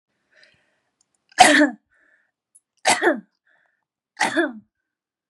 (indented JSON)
{
  "three_cough_length": "5.3 s",
  "three_cough_amplitude": 32768,
  "three_cough_signal_mean_std_ratio": 0.3,
  "survey_phase": "beta (2021-08-13 to 2022-03-07)",
  "age": "18-44",
  "gender": "Female",
  "wearing_mask": "No",
  "symptom_none": true,
  "smoker_status": "Never smoked",
  "respiratory_condition_asthma": false,
  "respiratory_condition_other": false,
  "recruitment_source": "REACT",
  "submission_delay": "1 day",
  "covid_test_result": "Negative",
  "covid_test_method": "RT-qPCR",
  "influenza_a_test_result": "Negative",
  "influenza_b_test_result": "Negative"
}